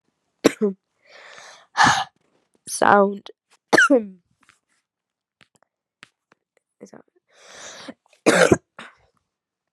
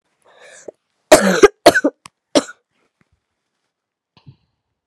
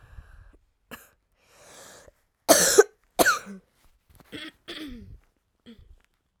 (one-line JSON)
{"exhalation_length": "9.7 s", "exhalation_amplitude": 32767, "exhalation_signal_mean_std_ratio": 0.29, "cough_length": "4.9 s", "cough_amplitude": 32768, "cough_signal_mean_std_ratio": 0.25, "three_cough_length": "6.4 s", "three_cough_amplitude": 31219, "three_cough_signal_mean_std_ratio": 0.25, "survey_phase": "alpha (2021-03-01 to 2021-08-12)", "age": "18-44", "gender": "Female", "wearing_mask": "No", "symptom_cough_any": true, "symptom_new_continuous_cough": true, "symptom_shortness_of_breath": true, "symptom_diarrhoea": true, "symptom_fatigue": true, "symptom_fever_high_temperature": true, "symptom_headache": true, "symptom_change_to_sense_of_smell_or_taste": true, "symptom_loss_of_taste": true, "symptom_onset": "3 days", "smoker_status": "Never smoked", "respiratory_condition_asthma": false, "respiratory_condition_other": false, "recruitment_source": "Test and Trace", "submission_delay": "2 days", "covid_test_result": "Positive", "covid_test_method": "RT-qPCR"}